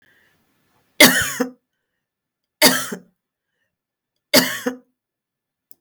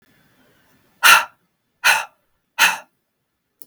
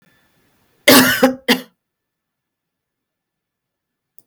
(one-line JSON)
{"three_cough_length": "5.8 s", "three_cough_amplitude": 32768, "three_cough_signal_mean_std_ratio": 0.28, "exhalation_length": "3.7 s", "exhalation_amplitude": 32768, "exhalation_signal_mean_std_ratio": 0.29, "cough_length": "4.3 s", "cough_amplitude": 32768, "cough_signal_mean_std_ratio": 0.27, "survey_phase": "beta (2021-08-13 to 2022-03-07)", "age": "65+", "gender": "Female", "wearing_mask": "No", "symptom_sore_throat": true, "symptom_headache": true, "symptom_onset": "3 days", "smoker_status": "Never smoked", "respiratory_condition_asthma": false, "respiratory_condition_other": true, "recruitment_source": "Test and Trace", "submission_delay": "1 day", "covid_test_result": "Negative", "covid_test_method": "RT-qPCR"}